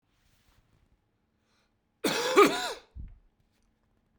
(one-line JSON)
{"cough_length": "4.2 s", "cough_amplitude": 14661, "cough_signal_mean_std_ratio": 0.27, "survey_phase": "beta (2021-08-13 to 2022-03-07)", "age": "18-44", "gender": "Male", "wearing_mask": "No", "symptom_cough_any": true, "symptom_runny_or_blocked_nose": true, "symptom_fatigue": true, "symptom_other": true, "symptom_onset": "6 days", "smoker_status": "Never smoked", "respiratory_condition_asthma": false, "respiratory_condition_other": false, "recruitment_source": "Test and Trace", "submission_delay": "1 day", "covid_test_result": "Positive", "covid_test_method": "RT-qPCR", "covid_ct_value": 20.3, "covid_ct_gene": "N gene"}